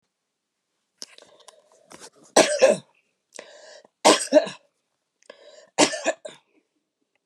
three_cough_length: 7.3 s
three_cough_amplitude: 32160
three_cough_signal_mean_std_ratio: 0.27
survey_phase: beta (2021-08-13 to 2022-03-07)
age: 65+
gender: Female
wearing_mask: 'No'
symptom_runny_or_blocked_nose: true
smoker_status: Never smoked
respiratory_condition_asthma: false
respiratory_condition_other: false
recruitment_source: REACT
submission_delay: 7 days
covid_test_result: Negative
covid_test_method: RT-qPCR
influenza_a_test_result: Negative
influenza_b_test_result: Negative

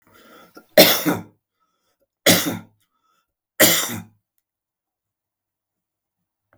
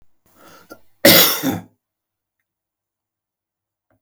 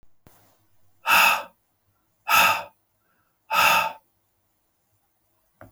three_cough_length: 6.6 s
three_cough_amplitude: 32768
three_cough_signal_mean_std_ratio: 0.28
cough_length: 4.0 s
cough_amplitude: 32768
cough_signal_mean_std_ratio: 0.26
exhalation_length: 5.7 s
exhalation_amplitude: 19092
exhalation_signal_mean_std_ratio: 0.36
survey_phase: beta (2021-08-13 to 2022-03-07)
age: 65+
gender: Male
wearing_mask: 'No'
symptom_runny_or_blocked_nose: true
symptom_onset: 12 days
smoker_status: Ex-smoker
respiratory_condition_asthma: false
respiratory_condition_other: false
recruitment_source: REACT
submission_delay: 0 days
covid_test_result: Negative
covid_test_method: RT-qPCR
influenza_a_test_result: Negative
influenza_b_test_result: Negative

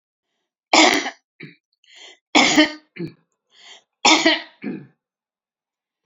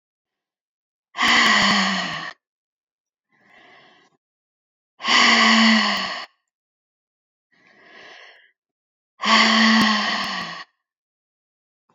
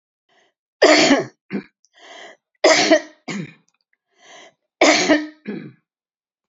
three_cough_length: 6.1 s
three_cough_amplitude: 32768
three_cough_signal_mean_std_ratio: 0.34
exhalation_length: 11.9 s
exhalation_amplitude: 25234
exhalation_signal_mean_std_ratio: 0.44
cough_length: 6.5 s
cough_amplitude: 31046
cough_signal_mean_std_ratio: 0.38
survey_phase: beta (2021-08-13 to 2022-03-07)
age: 65+
gender: Female
wearing_mask: 'No'
symptom_none: true
smoker_status: Ex-smoker
respiratory_condition_asthma: false
respiratory_condition_other: false
recruitment_source: REACT
submission_delay: 2 days
covid_test_result: Negative
covid_test_method: RT-qPCR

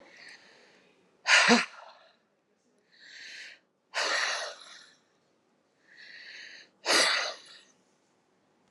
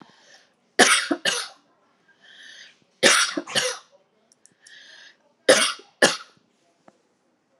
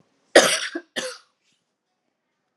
exhalation_length: 8.7 s
exhalation_amplitude: 18890
exhalation_signal_mean_std_ratio: 0.33
three_cough_length: 7.6 s
three_cough_amplitude: 30920
three_cough_signal_mean_std_ratio: 0.33
cough_length: 2.6 s
cough_amplitude: 32767
cough_signal_mean_std_ratio: 0.26
survey_phase: alpha (2021-03-01 to 2021-08-12)
age: 45-64
gender: Female
wearing_mask: 'Yes'
symptom_none: true
smoker_status: Ex-smoker
respiratory_condition_asthma: false
respiratory_condition_other: false
recruitment_source: Test and Trace
submission_delay: 0 days
covid_test_result: Negative
covid_test_method: LFT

